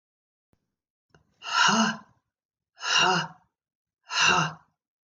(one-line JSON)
{"exhalation_length": "5.0 s", "exhalation_amplitude": 11400, "exhalation_signal_mean_std_ratio": 0.42, "survey_phase": "beta (2021-08-13 to 2022-03-07)", "age": "65+", "gender": "Female", "wearing_mask": "No", "symptom_cough_any": true, "symptom_runny_or_blocked_nose": true, "symptom_sore_throat": true, "symptom_onset": "7 days", "smoker_status": "Never smoked", "respiratory_condition_asthma": false, "respiratory_condition_other": false, "recruitment_source": "REACT", "submission_delay": "1 day", "covid_test_result": "Negative", "covid_test_method": "RT-qPCR", "influenza_a_test_result": "Negative", "influenza_b_test_result": "Negative"}